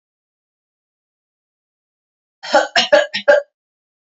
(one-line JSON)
{"three_cough_length": "4.1 s", "three_cough_amplitude": 32767, "three_cough_signal_mean_std_ratio": 0.29, "survey_phase": "beta (2021-08-13 to 2022-03-07)", "age": "18-44", "gender": "Female", "wearing_mask": "No", "symptom_none": true, "smoker_status": "Ex-smoker", "respiratory_condition_asthma": false, "respiratory_condition_other": false, "recruitment_source": "REACT", "submission_delay": "3 days", "covid_test_result": "Negative", "covid_test_method": "RT-qPCR", "influenza_a_test_result": "Unknown/Void", "influenza_b_test_result": "Unknown/Void"}